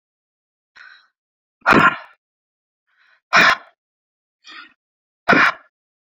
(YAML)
exhalation_length: 6.1 s
exhalation_amplitude: 28905
exhalation_signal_mean_std_ratio: 0.28
survey_phase: beta (2021-08-13 to 2022-03-07)
age: 45-64
gender: Female
wearing_mask: 'No'
symptom_cough_any: true
symptom_onset: 12 days
smoker_status: Never smoked
respiratory_condition_asthma: false
respiratory_condition_other: false
recruitment_source: REACT
submission_delay: 2 days
covid_test_result: Negative
covid_test_method: RT-qPCR